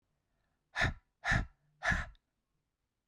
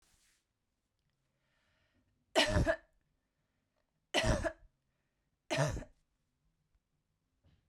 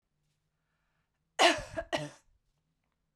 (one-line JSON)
{"exhalation_length": "3.1 s", "exhalation_amplitude": 4336, "exhalation_signal_mean_std_ratio": 0.36, "three_cough_length": "7.7 s", "three_cough_amplitude": 5328, "three_cough_signal_mean_std_ratio": 0.29, "cough_length": "3.2 s", "cough_amplitude": 9557, "cough_signal_mean_std_ratio": 0.25, "survey_phase": "beta (2021-08-13 to 2022-03-07)", "age": "18-44", "gender": "Female", "wearing_mask": "No", "symptom_runny_or_blocked_nose": true, "symptom_diarrhoea": true, "smoker_status": "Never smoked", "respiratory_condition_asthma": false, "respiratory_condition_other": false, "recruitment_source": "Test and Trace", "submission_delay": "1 day", "covid_test_result": "Positive", "covid_test_method": "RT-qPCR", "covid_ct_value": 25.9, "covid_ct_gene": "ORF1ab gene"}